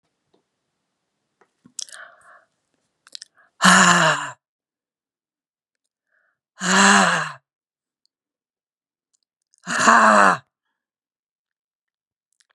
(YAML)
exhalation_length: 12.5 s
exhalation_amplitude: 32767
exhalation_signal_mean_std_ratio: 0.3
survey_phase: beta (2021-08-13 to 2022-03-07)
age: 65+
gender: Female
wearing_mask: 'No'
symptom_none: true
symptom_onset: 5 days
smoker_status: Ex-smoker
respiratory_condition_asthma: false
respiratory_condition_other: false
recruitment_source: Test and Trace
submission_delay: 1 day
covid_test_result: Positive
covid_test_method: RT-qPCR
covid_ct_value: 18.2
covid_ct_gene: ORF1ab gene
covid_ct_mean: 18.5
covid_viral_load: 890000 copies/ml
covid_viral_load_category: Low viral load (10K-1M copies/ml)